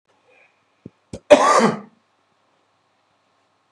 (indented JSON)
{
  "cough_length": "3.7 s",
  "cough_amplitude": 32768,
  "cough_signal_mean_std_ratio": 0.26,
  "survey_phase": "beta (2021-08-13 to 2022-03-07)",
  "age": "45-64",
  "gender": "Male",
  "wearing_mask": "No",
  "symptom_cough_any": true,
  "symptom_runny_or_blocked_nose": true,
  "symptom_shortness_of_breath": true,
  "symptom_sore_throat": true,
  "symptom_fatigue": true,
  "symptom_headache": true,
  "symptom_onset": "4 days",
  "smoker_status": "Ex-smoker",
  "respiratory_condition_asthma": false,
  "respiratory_condition_other": false,
  "recruitment_source": "Test and Trace",
  "submission_delay": "2 days",
  "covid_test_result": "Positive",
  "covid_test_method": "RT-qPCR",
  "covid_ct_value": 17.8,
  "covid_ct_gene": "ORF1ab gene",
  "covid_ct_mean": 18.2,
  "covid_viral_load": "1100000 copies/ml",
  "covid_viral_load_category": "High viral load (>1M copies/ml)"
}